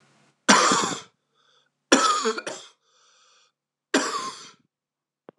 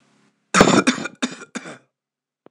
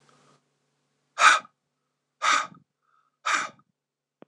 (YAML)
three_cough_length: 5.4 s
three_cough_amplitude: 26027
three_cough_signal_mean_std_ratio: 0.37
cough_length: 2.5 s
cough_amplitude: 26028
cough_signal_mean_std_ratio: 0.35
exhalation_length: 4.3 s
exhalation_amplitude: 22227
exhalation_signal_mean_std_ratio: 0.28
survey_phase: beta (2021-08-13 to 2022-03-07)
age: 45-64
gender: Male
wearing_mask: 'No'
symptom_cough_any: true
symptom_headache: true
symptom_onset: 2 days
smoker_status: Ex-smoker
respiratory_condition_asthma: false
respiratory_condition_other: false
recruitment_source: Test and Trace
submission_delay: 1 day
covid_test_result: Positive
covid_test_method: RT-qPCR